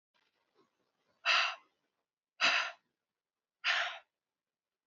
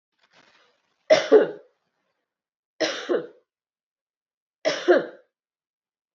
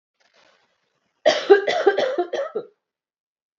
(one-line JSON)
{"exhalation_length": "4.9 s", "exhalation_amplitude": 5214, "exhalation_signal_mean_std_ratio": 0.33, "three_cough_length": "6.1 s", "three_cough_amplitude": 22895, "three_cough_signal_mean_std_ratio": 0.28, "cough_length": "3.6 s", "cough_amplitude": 31193, "cough_signal_mean_std_ratio": 0.38, "survey_phase": "beta (2021-08-13 to 2022-03-07)", "age": "18-44", "gender": "Female", "wearing_mask": "No", "symptom_cough_any": true, "symptom_runny_or_blocked_nose": true, "smoker_status": "Never smoked", "respiratory_condition_asthma": false, "respiratory_condition_other": false, "recruitment_source": "Test and Trace", "submission_delay": "3 days", "covid_test_method": "RT-qPCR", "covid_ct_value": 29.9, "covid_ct_gene": "ORF1ab gene"}